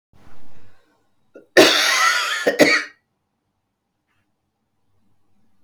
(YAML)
cough_length: 5.6 s
cough_amplitude: 32768
cough_signal_mean_std_ratio: 0.4
survey_phase: beta (2021-08-13 to 2022-03-07)
age: 45-64
gender: Female
wearing_mask: 'No'
symptom_cough_any: true
symptom_new_continuous_cough: true
symptom_runny_or_blocked_nose: true
symptom_shortness_of_breath: true
symptom_fatigue: true
symptom_onset: 3 days
smoker_status: Never smoked
respiratory_condition_asthma: false
respiratory_condition_other: true
recruitment_source: Test and Trace
submission_delay: 2 days
covid_test_result: Negative
covid_test_method: RT-qPCR